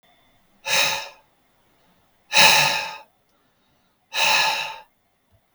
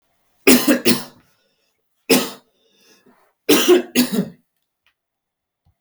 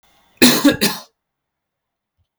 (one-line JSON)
{"exhalation_length": "5.5 s", "exhalation_amplitude": 32768, "exhalation_signal_mean_std_ratio": 0.4, "three_cough_length": "5.8 s", "three_cough_amplitude": 32768, "three_cough_signal_mean_std_ratio": 0.36, "cough_length": "2.4 s", "cough_amplitude": 32768, "cough_signal_mean_std_ratio": 0.34, "survey_phase": "beta (2021-08-13 to 2022-03-07)", "age": "18-44", "gender": "Male", "wearing_mask": "No", "symptom_none": true, "smoker_status": "Never smoked", "respiratory_condition_asthma": false, "respiratory_condition_other": false, "recruitment_source": "REACT", "submission_delay": "1 day", "covid_test_result": "Negative", "covid_test_method": "RT-qPCR"}